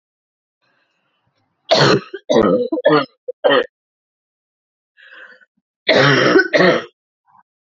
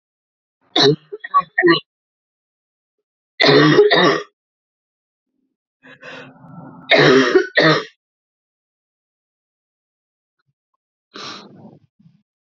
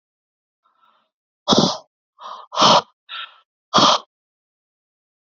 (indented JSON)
{
  "cough_length": "7.8 s",
  "cough_amplitude": 31677,
  "cough_signal_mean_std_ratio": 0.43,
  "three_cough_length": "12.5 s",
  "three_cough_amplitude": 32124,
  "three_cough_signal_mean_std_ratio": 0.35,
  "exhalation_length": "5.4 s",
  "exhalation_amplitude": 31434,
  "exhalation_signal_mean_std_ratio": 0.31,
  "survey_phase": "alpha (2021-03-01 to 2021-08-12)",
  "age": "18-44",
  "gender": "Female",
  "wearing_mask": "No",
  "symptom_cough_any": true,
  "symptom_new_continuous_cough": true,
  "symptom_fever_high_temperature": true,
  "symptom_change_to_sense_of_smell_or_taste": true,
  "symptom_loss_of_taste": true,
  "symptom_onset": "3 days",
  "smoker_status": "Current smoker (e-cigarettes or vapes only)",
  "respiratory_condition_asthma": false,
  "respiratory_condition_other": false,
  "recruitment_source": "Test and Trace",
  "submission_delay": "2 days",
  "covid_test_result": "Positive",
  "covid_test_method": "RT-qPCR"
}